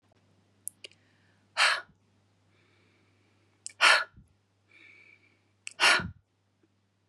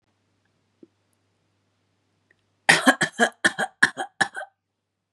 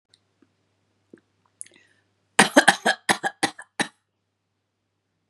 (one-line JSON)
{"exhalation_length": "7.1 s", "exhalation_amplitude": 16889, "exhalation_signal_mean_std_ratio": 0.25, "three_cough_length": "5.1 s", "three_cough_amplitude": 30630, "three_cough_signal_mean_std_ratio": 0.26, "cough_length": "5.3 s", "cough_amplitude": 32767, "cough_signal_mean_std_ratio": 0.22, "survey_phase": "beta (2021-08-13 to 2022-03-07)", "age": "45-64", "gender": "Female", "wearing_mask": "No", "symptom_cough_any": true, "symptom_runny_or_blocked_nose": true, "symptom_fatigue": true, "symptom_headache": true, "symptom_onset": "4 days", "smoker_status": "Never smoked", "respiratory_condition_asthma": false, "respiratory_condition_other": false, "recruitment_source": "Test and Trace", "submission_delay": "1 day", "covid_test_result": "Positive", "covid_test_method": "RT-qPCR", "covid_ct_value": 36.2, "covid_ct_gene": "N gene"}